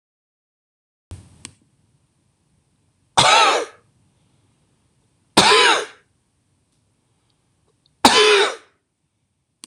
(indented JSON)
{
  "three_cough_length": "9.7 s",
  "three_cough_amplitude": 26028,
  "three_cough_signal_mean_std_ratio": 0.31,
  "survey_phase": "beta (2021-08-13 to 2022-03-07)",
  "age": "45-64",
  "gender": "Male",
  "wearing_mask": "No",
  "symptom_fatigue": true,
  "smoker_status": "Never smoked",
  "respiratory_condition_asthma": false,
  "respiratory_condition_other": false,
  "recruitment_source": "REACT",
  "submission_delay": "1 day",
  "covid_test_result": "Negative",
  "covid_test_method": "RT-qPCR",
  "influenza_a_test_result": "Unknown/Void",
  "influenza_b_test_result": "Unknown/Void"
}